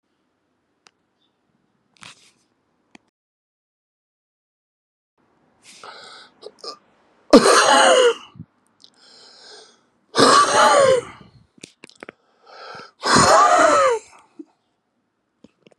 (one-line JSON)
{"exhalation_length": "15.8 s", "exhalation_amplitude": 32768, "exhalation_signal_mean_std_ratio": 0.35, "survey_phase": "beta (2021-08-13 to 2022-03-07)", "age": "45-64", "gender": "Male", "wearing_mask": "No", "symptom_cough_any": true, "symptom_runny_or_blocked_nose": true, "symptom_shortness_of_breath": true, "symptom_fatigue": true, "symptom_headache": true, "symptom_loss_of_taste": true, "symptom_onset": "2 days", "smoker_status": "Never smoked", "respiratory_condition_asthma": false, "respiratory_condition_other": false, "recruitment_source": "Test and Trace", "submission_delay": "2 days", "covid_test_result": "Positive", "covid_test_method": "RT-qPCR", "covid_ct_value": 14.6, "covid_ct_gene": "ORF1ab gene", "covid_ct_mean": 15.0, "covid_viral_load": "12000000 copies/ml", "covid_viral_load_category": "High viral load (>1M copies/ml)"}